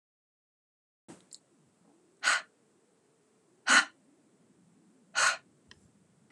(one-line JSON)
{"exhalation_length": "6.3 s", "exhalation_amplitude": 10932, "exhalation_signal_mean_std_ratio": 0.23, "survey_phase": "beta (2021-08-13 to 2022-03-07)", "age": "45-64", "gender": "Female", "wearing_mask": "No", "symptom_none": true, "smoker_status": "Never smoked", "respiratory_condition_asthma": false, "respiratory_condition_other": false, "recruitment_source": "REACT", "submission_delay": "1 day", "covid_test_result": "Negative", "covid_test_method": "RT-qPCR"}